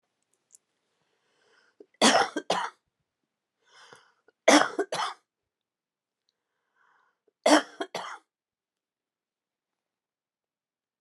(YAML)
three_cough_length: 11.0 s
three_cough_amplitude: 18961
three_cough_signal_mean_std_ratio: 0.23
survey_phase: beta (2021-08-13 to 2022-03-07)
age: 65+
gender: Female
wearing_mask: 'No'
symptom_abdominal_pain: true
symptom_fatigue: true
symptom_onset: 12 days
smoker_status: Current smoker (1 to 10 cigarettes per day)
respiratory_condition_asthma: false
respiratory_condition_other: false
recruitment_source: REACT
submission_delay: 3 days
covid_test_result: Negative
covid_test_method: RT-qPCR